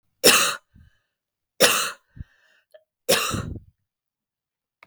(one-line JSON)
{"three_cough_length": "4.9 s", "three_cough_amplitude": 32652, "three_cough_signal_mean_std_ratio": 0.33, "survey_phase": "beta (2021-08-13 to 2022-03-07)", "age": "45-64", "gender": "Female", "wearing_mask": "No", "symptom_cough_any": true, "symptom_runny_or_blocked_nose": true, "symptom_fatigue": true, "symptom_onset": "3 days", "smoker_status": "Never smoked", "respiratory_condition_asthma": false, "respiratory_condition_other": false, "recruitment_source": "Test and Trace", "submission_delay": "2 days", "covid_test_result": "Positive", "covid_test_method": "RT-qPCR", "covid_ct_value": 17.3, "covid_ct_gene": "ORF1ab gene", "covid_ct_mean": 18.4, "covid_viral_load": "960000 copies/ml", "covid_viral_load_category": "Low viral load (10K-1M copies/ml)"}